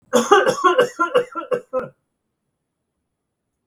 {
  "three_cough_length": "3.7 s",
  "three_cough_amplitude": 32766,
  "three_cough_signal_mean_std_ratio": 0.43,
  "survey_phase": "beta (2021-08-13 to 2022-03-07)",
  "age": "65+",
  "gender": "Male",
  "wearing_mask": "No",
  "symptom_none": true,
  "smoker_status": "Ex-smoker",
  "respiratory_condition_asthma": false,
  "respiratory_condition_other": false,
  "recruitment_source": "REACT",
  "submission_delay": "3 days",
  "covid_test_result": "Negative",
  "covid_test_method": "RT-qPCR",
  "influenza_a_test_result": "Negative",
  "influenza_b_test_result": "Negative"
}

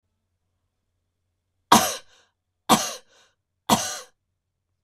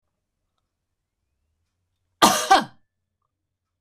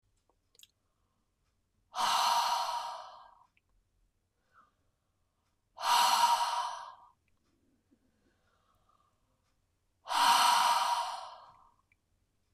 {
  "three_cough_length": "4.8 s",
  "three_cough_amplitude": 25992,
  "three_cough_signal_mean_std_ratio": 0.25,
  "cough_length": "3.8 s",
  "cough_amplitude": 25998,
  "cough_signal_mean_std_ratio": 0.22,
  "exhalation_length": "12.5 s",
  "exhalation_amplitude": 6419,
  "exhalation_signal_mean_std_ratio": 0.41,
  "survey_phase": "beta (2021-08-13 to 2022-03-07)",
  "age": "45-64",
  "gender": "Female",
  "wearing_mask": "No",
  "symptom_none": true,
  "smoker_status": "Never smoked",
  "respiratory_condition_asthma": true,
  "respiratory_condition_other": false,
  "recruitment_source": "REACT",
  "submission_delay": "2 days",
  "covid_test_result": "Negative",
  "covid_test_method": "RT-qPCR",
  "influenza_a_test_result": "Negative",
  "influenza_b_test_result": "Negative"
}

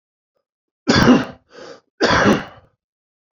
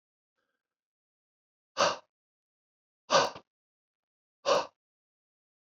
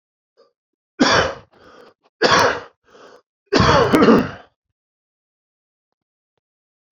{
  "cough_length": "3.3 s",
  "cough_amplitude": 28301,
  "cough_signal_mean_std_ratio": 0.4,
  "exhalation_length": "5.7 s",
  "exhalation_amplitude": 11543,
  "exhalation_signal_mean_std_ratio": 0.23,
  "three_cough_length": "6.9 s",
  "three_cough_amplitude": 28691,
  "three_cough_signal_mean_std_ratio": 0.37,
  "survey_phase": "alpha (2021-03-01 to 2021-08-12)",
  "age": "45-64",
  "gender": "Male",
  "wearing_mask": "No",
  "symptom_headache": true,
  "symptom_loss_of_taste": true,
  "symptom_onset": "6 days",
  "smoker_status": "Never smoked",
  "respiratory_condition_asthma": true,
  "respiratory_condition_other": false,
  "recruitment_source": "Test and Trace",
  "submission_delay": "2 days",
  "covid_test_result": "Positive",
  "covid_test_method": "RT-qPCR",
  "covid_ct_value": 20.3,
  "covid_ct_gene": "ORF1ab gene",
  "covid_ct_mean": 21.0,
  "covid_viral_load": "130000 copies/ml",
  "covid_viral_load_category": "Low viral load (10K-1M copies/ml)"
}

